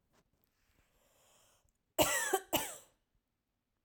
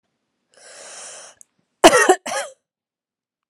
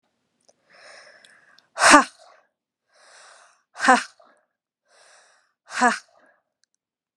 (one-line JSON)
{"three_cough_length": "3.8 s", "three_cough_amplitude": 6015, "three_cough_signal_mean_std_ratio": 0.3, "cough_length": "3.5 s", "cough_amplitude": 32768, "cough_signal_mean_std_ratio": 0.26, "exhalation_length": "7.2 s", "exhalation_amplitude": 32767, "exhalation_signal_mean_std_ratio": 0.22, "survey_phase": "alpha (2021-03-01 to 2021-08-12)", "age": "18-44", "gender": "Female", "wearing_mask": "No", "symptom_none": true, "smoker_status": "Never smoked", "respiratory_condition_asthma": false, "respiratory_condition_other": false, "recruitment_source": "REACT", "covid_test_method": "RT-qPCR"}